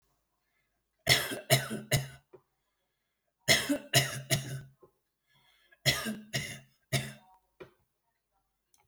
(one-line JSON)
{"three_cough_length": "8.9 s", "three_cough_amplitude": 12885, "three_cough_signal_mean_std_ratio": 0.35, "survey_phase": "alpha (2021-03-01 to 2021-08-12)", "age": "65+", "gender": "Male", "wearing_mask": "No", "symptom_none": true, "smoker_status": "Never smoked", "respiratory_condition_asthma": false, "respiratory_condition_other": false, "recruitment_source": "REACT", "submission_delay": "6 days", "covid_test_result": "Negative", "covid_test_method": "RT-qPCR"}